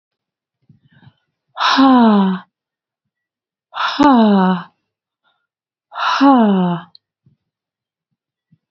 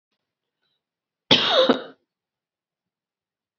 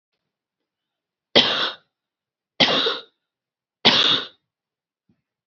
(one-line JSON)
{"exhalation_length": "8.7 s", "exhalation_amplitude": 28090, "exhalation_signal_mean_std_ratio": 0.44, "cough_length": "3.6 s", "cough_amplitude": 28041, "cough_signal_mean_std_ratio": 0.28, "three_cough_length": "5.5 s", "three_cough_amplitude": 32767, "three_cough_signal_mean_std_ratio": 0.34, "survey_phase": "alpha (2021-03-01 to 2021-08-12)", "age": "45-64", "gender": "Female", "wearing_mask": "No", "symptom_none": true, "smoker_status": "Never smoked", "respiratory_condition_asthma": false, "respiratory_condition_other": false, "recruitment_source": "REACT", "submission_delay": "1 day", "covid_test_result": "Negative", "covid_test_method": "RT-qPCR"}